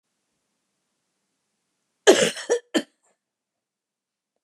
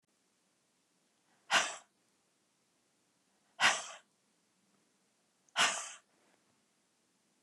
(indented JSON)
{
  "cough_length": "4.4 s",
  "cough_amplitude": 29619,
  "cough_signal_mean_std_ratio": 0.22,
  "exhalation_length": "7.4 s",
  "exhalation_amplitude": 6763,
  "exhalation_signal_mean_std_ratio": 0.24,
  "survey_phase": "beta (2021-08-13 to 2022-03-07)",
  "age": "65+",
  "gender": "Female",
  "wearing_mask": "No",
  "symptom_cough_any": true,
  "symptom_runny_or_blocked_nose": true,
  "symptom_onset": "12 days",
  "smoker_status": "Ex-smoker",
  "respiratory_condition_asthma": false,
  "respiratory_condition_other": false,
  "recruitment_source": "REACT",
  "submission_delay": "2 days",
  "covid_test_result": "Negative",
  "covid_test_method": "RT-qPCR"
}